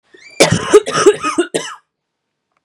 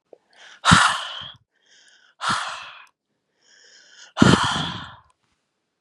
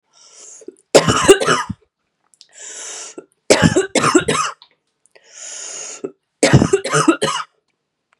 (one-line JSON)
{"cough_length": "2.6 s", "cough_amplitude": 32768, "cough_signal_mean_std_ratio": 0.44, "exhalation_length": "5.8 s", "exhalation_amplitude": 32767, "exhalation_signal_mean_std_ratio": 0.34, "three_cough_length": "8.2 s", "three_cough_amplitude": 32768, "three_cough_signal_mean_std_ratio": 0.42, "survey_phase": "beta (2021-08-13 to 2022-03-07)", "age": "18-44", "gender": "Female", "wearing_mask": "No", "symptom_cough_any": true, "symptom_new_continuous_cough": true, "symptom_runny_or_blocked_nose": true, "smoker_status": "Current smoker (1 to 10 cigarettes per day)", "respiratory_condition_asthma": false, "respiratory_condition_other": false, "recruitment_source": "Test and Trace", "submission_delay": "2 days", "covid_test_result": "Positive", "covid_test_method": "RT-qPCR", "covid_ct_value": 23.7, "covid_ct_gene": "ORF1ab gene", "covid_ct_mean": 24.3, "covid_viral_load": "11000 copies/ml", "covid_viral_load_category": "Low viral load (10K-1M copies/ml)"}